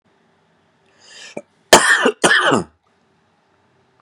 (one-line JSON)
{"cough_length": "4.0 s", "cough_amplitude": 32768, "cough_signal_mean_std_ratio": 0.34, "survey_phase": "beta (2021-08-13 to 2022-03-07)", "age": "18-44", "gender": "Male", "wearing_mask": "No", "symptom_cough_any": true, "symptom_new_continuous_cough": true, "symptom_sore_throat": true, "symptom_onset": "2 days", "smoker_status": "Ex-smoker", "respiratory_condition_asthma": false, "respiratory_condition_other": false, "recruitment_source": "Test and Trace", "submission_delay": "1 day", "covid_test_method": "RT-qPCR"}